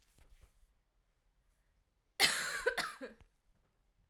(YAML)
cough_length: 4.1 s
cough_amplitude: 6557
cough_signal_mean_std_ratio: 0.3
survey_phase: alpha (2021-03-01 to 2021-08-12)
age: 18-44
gender: Female
wearing_mask: 'No'
symptom_cough_any: true
symptom_new_continuous_cough: true
symptom_shortness_of_breath: true
symptom_fatigue: true
symptom_fever_high_temperature: true
symptom_change_to_sense_of_smell_or_taste: true
symptom_onset: 4 days
smoker_status: Never smoked
respiratory_condition_asthma: false
respiratory_condition_other: false
recruitment_source: Test and Trace
submission_delay: 2 days
covid_test_result: Positive
covid_test_method: RT-qPCR